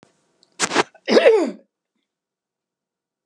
{"cough_length": "3.3 s", "cough_amplitude": 31943, "cough_signal_mean_std_ratio": 0.33, "survey_phase": "beta (2021-08-13 to 2022-03-07)", "age": "65+", "gender": "Female", "wearing_mask": "No", "symptom_none": true, "symptom_onset": "13 days", "smoker_status": "Never smoked", "respiratory_condition_asthma": false, "respiratory_condition_other": false, "recruitment_source": "REACT", "submission_delay": "3 days", "covid_test_result": "Negative", "covid_test_method": "RT-qPCR", "influenza_a_test_result": "Negative", "influenza_b_test_result": "Negative"}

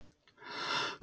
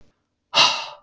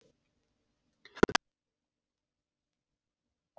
{"cough_length": "1.0 s", "cough_amplitude": 2225, "cough_signal_mean_std_ratio": 0.65, "exhalation_length": "1.0 s", "exhalation_amplitude": 24808, "exhalation_signal_mean_std_ratio": 0.41, "three_cough_length": "3.6 s", "three_cough_amplitude": 13493, "three_cough_signal_mean_std_ratio": 0.08, "survey_phase": "beta (2021-08-13 to 2022-03-07)", "age": "45-64", "gender": "Male", "wearing_mask": "No", "symptom_cough_any": true, "symptom_runny_or_blocked_nose": true, "symptom_sore_throat": true, "symptom_headache": true, "symptom_onset": "1 day", "smoker_status": "Current smoker (1 to 10 cigarettes per day)", "respiratory_condition_asthma": false, "respiratory_condition_other": false, "recruitment_source": "Test and Trace", "submission_delay": "1 day", "covid_test_result": "Negative", "covid_test_method": "RT-qPCR"}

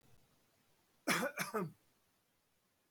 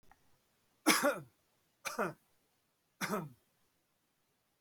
{"cough_length": "2.9 s", "cough_amplitude": 2769, "cough_signal_mean_std_ratio": 0.35, "three_cough_length": "4.6 s", "three_cough_amplitude": 7045, "three_cough_signal_mean_std_ratio": 0.3, "survey_phase": "beta (2021-08-13 to 2022-03-07)", "age": "45-64", "gender": "Male", "wearing_mask": "No", "symptom_none": true, "smoker_status": "Never smoked", "respiratory_condition_asthma": false, "respiratory_condition_other": false, "recruitment_source": "REACT", "submission_delay": "6 days", "covid_test_result": "Negative", "covid_test_method": "RT-qPCR", "covid_ct_value": 46.0, "covid_ct_gene": "N gene"}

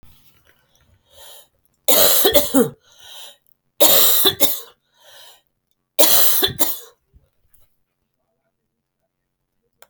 {"three_cough_length": "9.9 s", "three_cough_amplitude": 32768, "three_cough_signal_mean_std_ratio": 0.38, "survey_phase": "beta (2021-08-13 to 2022-03-07)", "age": "45-64", "gender": "Female", "wearing_mask": "No", "symptom_runny_or_blocked_nose": true, "symptom_shortness_of_breath": true, "symptom_fatigue": true, "symptom_onset": "12 days", "smoker_status": "Never smoked", "respiratory_condition_asthma": false, "respiratory_condition_other": false, "recruitment_source": "REACT", "submission_delay": "2 days", "covid_test_result": "Negative", "covid_test_method": "RT-qPCR", "covid_ct_value": 38.8, "covid_ct_gene": "E gene", "influenza_a_test_result": "Negative", "influenza_b_test_result": "Negative"}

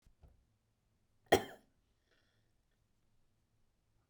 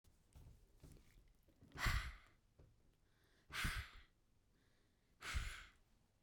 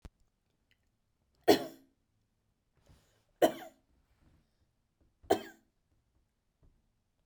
{"cough_length": "4.1 s", "cough_amplitude": 7374, "cough_signal_mean_std_ratio": 0.13, "exhalation_length": "6.2 s", "exhalation_amplitude": 1737, "exhalation_signal_mean_std_ratio": 0.38, "three_cough_length": "7.3 s", "three_cough_amplitude": 10796, "three_cough_signal_mean_std_ratio": 0.17, "survey_phase": "beta (2021-08-13 to 2022-03-07)", "age": "45-64", "gender": "Female", "wearing_mask": "No", "symptom_none": true, "smoker_status": "Never smoked", "respiratory_condition_asthma": false, "respiratory_condition_other": false, "recruitment_source": "REACT", "submission_delay": "2 days", "covid_test_result": "Negative", "covid_test_method": "RT-qPCR"}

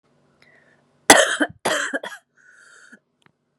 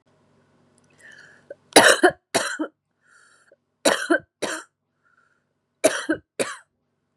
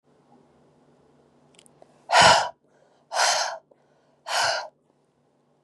{"cough_length": "3.6 s", "cough_amplitude": 32768, "cough_signal_mean_std_ratio": 0.28, "three_cough_length": "7.2 s", "three_cough_amplitude": 32768, "three_cough_signal_mean_std_ratio": 0.29, "exhalation_length": "5.6 s", "exhalation_amplitude": 27119, "exhalation_signal_mean_std_ratio": 0.33, "survey_phase": "beta (2021-08-13 to 2022-03-07)", "age": "18-44", "gender": "Female", "wearing_mask": "No", "symptom_cough_any": true, "symptom_runny_or_blocked_nose": true, "symptom_fatigue": true, "symptom_headache": true, "smoker_status": "Never smoked", "respiratory_condition_asthma": false, "respiratory_condition_other": false, "recruitment_source": "Test and Trace", "submission_delay": "3 days", "covid_test_result": "Positive", "covid_test_method": "LFT"}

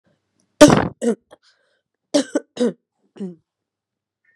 {"cough_length": "4.4 s", "cough_amplitude": 32768, "cough_signal_mean_std_ratio": 0.27, "survey_phase": "beta (2021-08-13 to 2022-03-07)", "age": "18-44", "gender": "Female", "wearing_mask": "No", "symptom_cough_any": true, "symptom_new_continuous_cough": true, "symptom_fatigue": true, "symptom_headache": true, "symptom_onset": "3 days", "smoker_status": "Never smoked", "respiratory_condition_asthma": false, "respiratory_condition_other": false, "recruitment_source": "Test and Trace", "submission_delay": "1 day", "covid_test_result": "Positive", "covid_test_method": "RT-qPCR", "covid_ct_value": 22.5, "covid_ct_gene": "N gene"}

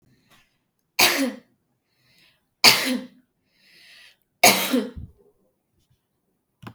{"three_cough_length": "6.7 s", "three_cough_amplitude": 32768, "three_cough_signal_mean_std_ratio": 0.29, "survey_phase": "beta (2021-08-13 to 2022-03-07)", "age": "18-44", "gender": "Female", "wearing_mask": "No", "symptom_none": true, "symptom_onset": "12 days", "smoker_status": "Never smoked", "respiratory_condition_asthma": false, "respiratory_condition_other": false, "recruitment_source": "REACT", "submission_delay": "10 days", "covid_test_result": "Negative", "covid_test_method": "RT-qPCR", "influenza_a_test_result": "Negative", "influenza_b_test_result": "Negative"}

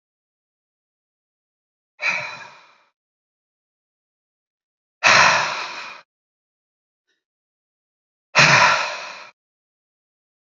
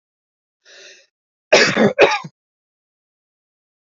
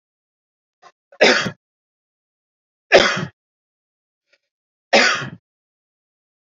{"exhalation_length": "10.5 s", "exhalation_amplitude": 32767, "exhalation_signal_mean_std_ratio": 0.28, "cough_length": "3.9 s", "cough_amplitude": 29567, "cough_signal_mean_std_ratio": 0.3, "three_cough_length": "6.6 s", "three_cough_amplitude": 29575, "three_cough_signal_mean_std_ratio": 0.27, "survey_phase": "beta (2021-08-13 to 2022-03-07)", "age": "45-64", "gender": "Male", "wearing_mask": "No", "symptom_none": true, "smoker_status": "Never smoked", "respiratory_condition_asthma": true, "respiratory_condition_other": false, "recruitment_source": "REACT", "submission_delay": "2 days", "covid_test_result": "Negative", "covid_test_method": "RT-qPCR", "influenza_a_test_result": "Unknown/Void", "influenza_b_test_result": "Unknown/Void"}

